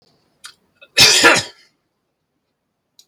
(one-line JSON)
{"cough_length": "3.1 s", "cough_amplitude": 32768, "cough_signal_mean_std_ratio": 0.31, "survey_phase": "beta (2021-08-13 to 2022-03-07)", "age": "65+", "gender": "Male", "wearing_mask": "No", "symptom_none": true, "smoker_status": "Never smoked", "respiratory_condition_asthma": false, "respiratory_condition_other": false, "recruitment_source": "REACT", "submission_delay": "3 days", "covid_test_result": "Negative", "covid_test_method": "RT-qPCR"}